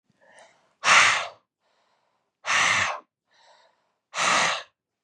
{"exhalation_length": "5.0 s", "exhalation_amplitude": 21434, "exhalation_signal_mean_std_ratio": 0.41, "survey_phase": "beta (2021-08-13 to 2022-03-07)", "age": "18-44", "gender": "Male", "wearing_mask": "No", "symptom_none": true, "smoker_status": "Never smoked", "respiratory_condition_asthma": false, "respiratory_condition_other": false, "recruitment_source": "REACT", "submission_delay": "2 days", "covid_test_result": "Negative", "covid_test_method": "RT-qPCR", "influenza_a_test_result": "Unknown/Void", "influenza_b_test_result": "Unknown/Void"}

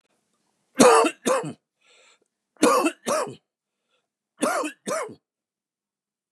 {"three_cough_length": "6.3 s", "three_cough_amplitude": 27727, "three_cough_signal_mean_std_ratio": 0.36, "survey_phase": "beta (2021-08-13 to 2022-03-07)", "age": "45-64", "gender": "Male", "wearing_mask": "No", "symptom_cough_any": true, "smoker_status": "Never smoked", "respiratory_condition_asthma": false, "respiratory_condition_other": false, "recruitment_source": "REACT", "submission_delay": "2 days", "covid_test_result": "Negative", "covid_test_method": "RT-qPCR", "influenza_a_test_result": "Negative", "influenza_b_test_result": "Negative"}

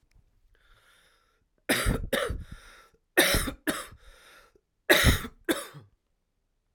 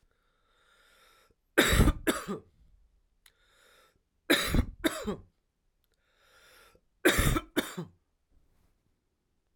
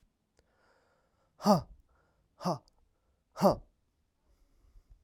{"cough_length": "6.7 s", "cough_amplitude": 20413, "cough_signal_mean_std_ratio": 0.37, "three_cough_length": "9.6 s", "three_cough_amplitude": 16341, "three_cough_signal_mean_std_ratio": 0.32, "exhalation_length": "5.0 s", "exhalation_amplitude": 8542, "exhalation_signal_mean_std_ratio": 0.24, "survey_phase": "alpha (2021-03-01 to 2021-08-12)", "age": "18-44", "gender": "Male", "wearing_mask": "No", "symptom_none": true, "smoker_status": "Ex-smoker", "respiratory_condition_asthma": true, "respiratory_condition_other": false, "recruitment_source": "REACT", "submission_delay": "2 days", "covid_test_result": "Negative", "covid_test_method": "RT-qPCR"}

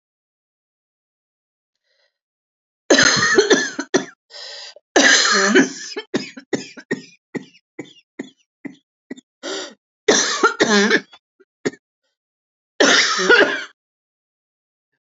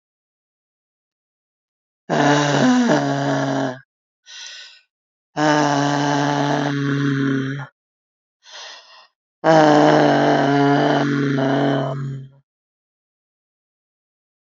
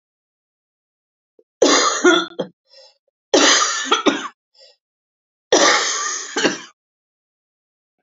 {"cough_length": "15.1 s", "cough_amplitude": 32768, "cough_signal_mean_std_ratio": 0.4, "exhalation_length": "14.4 s", "exhalation_amplitude": 31153, "exhalation_signal_mean_std_ratio": 0.57, "three_cough_length": "8.0 s", "three_cough_amplitude": 31130, "three_cough_signal_mean_std_ratio": 0.43, "survey_phase": "alpha (2021-03-01 to 2021-08-12)", "age": "45-64", "gender": "Female", "wearing_mask": "No", "symptom_cough_any": true, "symptom_shortness_of_breath": true, "symptom_abdominal_pain": true, "symptom_diarrhoea": true, "symptom_fatigue": true, "symptom_headache": true, "symptom_change_to_sense_of_smell_or_taste": true, "symptom_onset": "3 days", "smoker_status": "Never smoked", "respiratory_condition_asthma": false, "respiratory_condition_other": false, "recruitment_source": "Test and Trace", "submission_delay": "2 days", "covid_test_result": "Positive", "covid_test_method": "RT-qPCR", "covid_ct_value": 21.1, "covid_ct_gene": "ORF1ab gene", "covid_ct_mean": 21.7, "covid_viral_load": "75000 copies/ml", "covid_viral_load_category": "Low viral load (10K-1M copies/ml)"}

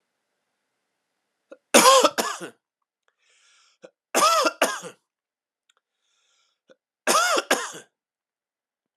{"cough_length": "9.0 s", "cough_amplitude": 31108, "cough_signal_mean_std_ratio": 0.31, "survey_phase": "alpha (2021-03-01 to 2021-08-12)", "age": "18-44", "gender": "Male", "wearing_mask": "No", "symptom_none": true, "smoker_status": "Ex-smoker", "respiratory_condition_asthma": false, "respiratory_condition_other": false, "recruitment_source": "REACT", "submission_delay": "2 days", "covid_test_result": "Negative", "covid_test_method": "RT-qPCR", "covid_ct_value": 40.0, "covid_ct_gene": "N gene"}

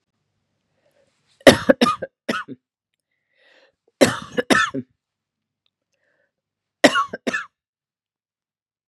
{"three_cough_length": "8.9 s", "three_cough_amplitude": 32768, "three_cough_signal_mean_std_ratio": 0.24, "survey_phase": "beta (2021-08-13 to 2022-03-07)", "age": "18-44", "gender": "Female", "wearing_mask": "No", "symptom_cough_any": true, "symptom_runny_or_blocked_nose": true, "symptom_sore_throat": true, "symptom_change_to_sense_of_smell_or_taste": true, "symptom_onset": "4 days", "smoker_status": "Never smoked", "respiratory_condition_asthma": false, "respiratory_condition_other": false, "recruitment_source": "Test and Trace", "submission_delay": "1 day", "covid_test_result": "Positive", "covid_test_method": "ePCR"}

